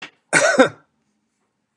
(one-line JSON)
{"cough_length": "1.8 s", "cough_amplitude": 32622, "cough_signal_mean_std_ratio": 0.34, "survey_phase": "beta (2021-08-13 to 2022-03-07)", "age": "65+", "gender": "Male", "wearing_mask": "No", "symptom_none": true, "smoker_status": "Never smoked", "respiratory_condition_asthma": false, "respiratory_condition_other": false, "recruitment_source": "REACT", "submission_delay": "1 day", "covid_test_result": "Negative", "covid_test_method": "RT-qPCR", "influenza_a_test_result": "Negative", "influenza_b_test_result": "Negative"}